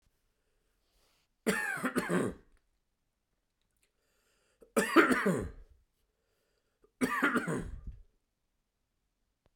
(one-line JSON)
{"three_cough_length": "9.6 s", "three_cough_amplitude": 11286, "three_cough_signal_mean_std_ratio": 0.35, "survey_phase": "beta (2021-08-13 to 2022-03-07)", "age": "45-64", "gender": "Male", "wearing_mask": "No", "symptom_runny_or_blocked_nose": true, "symptom_fatigue": true, "symptom_change_to_sense_of_smell_or_taste": true, "smoker_status": "Never smoked", "respiratory_condition_asthma": false, "respiratory_condition_other": false, "recruitment_source": "Test and Trace", "submission_delay": "2 days", "covid_test_result": "Positive", "covid_test_method": "RT-qPCR", "covid_ct_value": 17.7, "covid_ct_gene": "ORF1ab gene", "covid_ct_mean": 18.3, "covid_viral_load": "1000000 copies/ml", "covid_viral_load_category": "High viral load (>1M copies/ml)"}